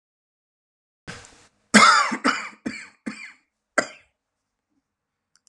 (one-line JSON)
{"cough_length": "5.5 s", "cough_amplitude": 30831, "cough_signal_mean_std_ratio": 0.28, "survey_phase": "alpha (2021-03-01 to 2021-08-12)", "age": "45-64", "gender": "Male", "wearing_mask": "No", "symptom_cough_any": true, "symptom_onset": "8 days", "smoker_status": "Never smoked", "respiratory_condition_asthma": true, "respiratory_condition_other": false, "recruitment_source": "REACT", "submission_delay": "2 days", "covid_test_result": "Negative", "covid_test_method": "RT-qPCR"}